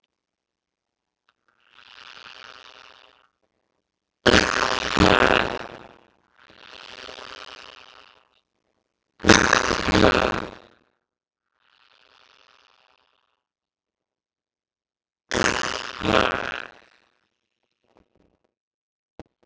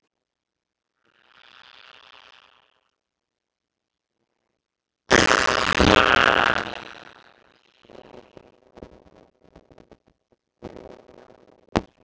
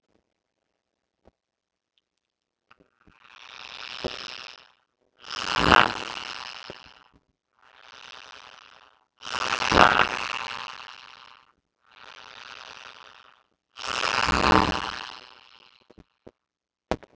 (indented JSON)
{
  "three_cough_length": "19.5 s",
  "three_cough_amplitude": 32768,
  "three_cough_signal_mean_std_ratio": 0.19,
  "cough_length": "12.0 s",
  "cough_amplitude": 32767,
  "cough_signal_mean_std_ratio": 0.18,
  "exhalation_length": "17.2 s",
  "exhalation_amplitude": 32768,
  "exhalation_signal_mean_std_ratio": 0.2,
  "survey_phase": "beta (2021-08-13 to 2022-03-07)",
  "age": "45-64",
  "gender": "Male",
  "wearing_mask": "No",
  "symptom_none": true,
  "symptom_onset": "9 days",
  "smoker_status": "Ex-smoker",
  "respiratory_condition_asthma": false,
  "respiratory_condition_other": false,
  "recruitment_source": "REACT",
  "submission_delay": "2 days",
  "covid_test_result": "Negative",
  "covid_test_method": "RT-qPCR",
  "influenza_a_test_result": "Unknown/Void",
  "influenza_b_test_result": "Unknown/Void"
}